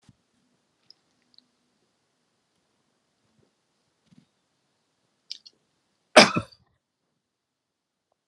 {"cough_length": "8.3 s", "cough_amplitude": 32438, "cough_signal_mean_std_ratio": 0.11, "survey_phase": "alpha (2021-03-01 to 2021-08-12)", "age": "65+", "gender": "Male", "wearing_mask": "No", "symptom_none": true, "smoker_status": "Never smoked", "respiratory_condition_asthma": false, "respiratory_condition_other": false, "recruitment_source": "REACT", "submission_delay": "3 days", "covid_test_result": "Negative", "covid_test_method": "RT-qPCR"}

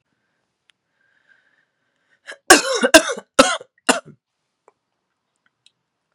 {"cough_length": "6.1 s", "cough_amplitude": 32768, "cough_signal_mean_std_ratio": 0.23, "survey_phase": "beta (2021-08-13 to 2022-03-07)", "age": "18-44", "gender": "Female", "wearing_mask": "No", "symptom_new_continuous_cough": true, "symptom_runny_or_blocked_nose": true, "symptom_shortness_of_breath": true, "symptom_sore_throat": true, "symptom_abdominal_pain": true, "symptom_fatigue": true, "symptom_fever_high_temperature": true, "symptom_headache": true, "symptom_change_to_sense_of_smell_or_taste": true, "smoker_status": "Ex-smoker", "respiratory_condition_asthma": true, "respiratory_condition_other": false, "recruitment_source": "Test and Trace", "submission_delay": "1 day", "covid_test_result": "Positive", "covid_test_method": "LFT"}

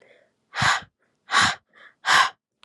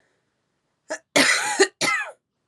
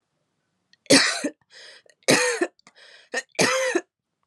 {"exhalation_length": "2.6 s", "exhalation_amplitude": 20590, "exhalation_signal_mean_std_ratio": 0.41, "cough_length": "2.5 s", "cough_amplitude": 25036, "cough_signal_mean_std_ratio": 0.44, "three_cough_length": "4.3 s", "three_cough_amplitude": 25854, "three_cough_signal_mean_std_ratio": 0.41, "survey_phase": "alpha (2021-03-01 to 2021-08-12)", "age": "18-44", "gender": "Female", "wearing_mask": "No", "symptom_shortness_of_breath": true, "symptom_fatigue": true, "symptom_headache": true, "symptom_change_to_sense_of_smell_or_taste": true, "symptom_loss_of_taste": true, "smoker_status": "Never smoked", "respiratory_condition_asthma": false, "respiratory_condition_other": false, "recruitment_source": "Test and Trace", "submission_delay": "2 days", "covid_test_result": "Positive", "covid_test_method": "RT-qPCR", "covid_ct_value": 15.1, "covid_ct_gene": "N gene", "covid_ct_mean": 15.1, "covid_viral_load": "11000000 copies/ml", "covid_viral_load_category": "High viral load (>1M copies/ml)"}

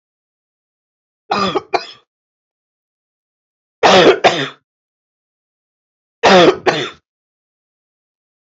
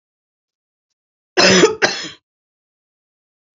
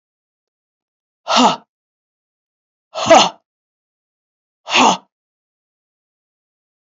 {"three_cough_length": "8.5 s", "three_cough_amplitude": 29262, "three_cough_signal_mean_std_ratio": 0.32, "cough_length": "3.6 s", "cough_amplitude": 31830, "cough_signal_mean_std_ratio": 0.3, "exhalation_length": "6.8 s", "exhalation_amplitude": 32536, "exhalation_signal_mean_std_ratio": 0.27, "survey_phase": "alpha (2021-03-01 to 2021-08-12)", "age": "45-64", "gender": "Female", "wearing_mask": "No", "symptom_cough_any": true, "symptom_diarrhoea": true, "symptom_fatigue": true, "symptom_headache": true, "symptom_onset": "3 days", "smoker_status": "Never smoked", "respiratory_condition_asthma": false, "respiratory_condition_other": false, "recruitment_source": "Test and Trace", "submission_delay": "2 days", "covid_test_result": "Positive", "covid_test_method": "RT-qPCR", "covid_ct_value": 22.7, "covid_ct_gene": "ORF1ab gene"}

